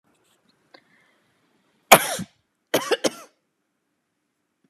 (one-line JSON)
{"cough_length": "4.7 s", "cough_amplitude": 32768, "cough_signal_mean_std_ratio": 0.19, "survey_phase": "beta (2021-08-13 to 2022-03-07)", "age": "45-64", "gender": "Female", "wearing_mask": "No", "symptom_none": true, "smoker_status": "Never smoked", "respiratory_condition_asthma": false, "respiratory_condition_other": false, "recruitment_source": "REACT", "submission_delay": "1 day", "covid_test_result": "Negative", "covid_test_method": "RT-qPCR", "influenza_a_test_result": "Negative", "influenza_b_test_result": "Negative"}